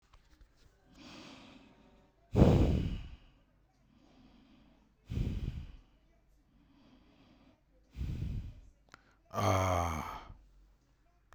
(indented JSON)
{
  "exhalation_length": "11.3 s",
  "exhalation_amplitude": 9885,
  "exhalation_signal_mean_std_ratio": 0.35,
  "survey_phase": "beta (2021-08-13 to 2022-03-07)",
  "age": "18-44",
  "gender": "Male",
  "wearing_mask": "No",
  "symptom_none": true,
  "smoker_status": "Ex-smoker",
  "respiratory_condition_asthma": false,
  "respiratory_condition_other": false,
  "recruitment_source": "REACT",
  "submission_delay": "22 days",
  "covid_test_result": "Negative",
  "covid_test_method": "RT-qPCR",
  "covid_ct_value": 46.0,
  "covid_ct_gene": "N gene"
}